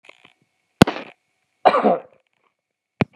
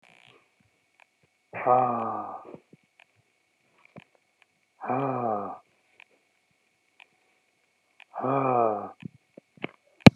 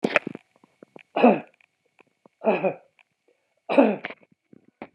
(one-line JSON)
{"cough_length": "3.2 s", "cough_amplitude": 32768, "cough_signal_mean_std_ratio": 0.25, "exhalation_length": "10.2 s", "exhalation_amplitude": 32768, "exhalation_signal_mean_std_ratio": 0.26, "three_cough_length": "4.9 s", "three_cough_amplitude": 32533, "three_cough_signal_mean_std_ratio": 0.3, "survey_phase": "beta (2021-08-13 to 2022-03-07)", "age": "45-64", "gender": "Male", "wearing_mask": "No", "symptom_none": true, "smoker_status": "Never smoked", "respiratory_condition_asthma": false, "respiratory_condition_other": false, "recruitment_source": "REACT", "submission_delay": "1 day", "covid_test_result": "Negative", "covid_test_method": "RT-qPCR"}